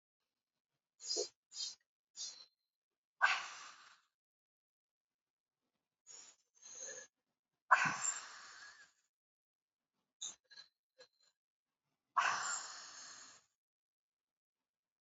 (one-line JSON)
{"exhalation_length": "15.0 s", "exhalation_amplitude": 5509, "exhalation_signal_mean_std_ratio": 0.27, "survey_phase": "beta (2021-08-13 to 2022-03-07)", "age": "45-64", "gender": "Female", "wearing_mask": "No", "symptom_cough_any": true, "symptom_diarrhoea": true, "symptom_fatigue": true, "smoker_status": "Never smoked", "respiratory_condition_asthma": false, "respiratory_condition_other": false, "recruitment_source": "Test and Trace", "submission_delay": "2 days", "covid_test_result": "Positive", "covid_test_method": "RT-qPCR", "covid_ct_value": 19.8, "covid_ct_gene": "ORF1ab gene", "covid_ct_mean": 20.4, "covid_viral_load": "200000 copies/ml", "covid_viral_load_category": "Low viral load (10K-1M copies/ml)"}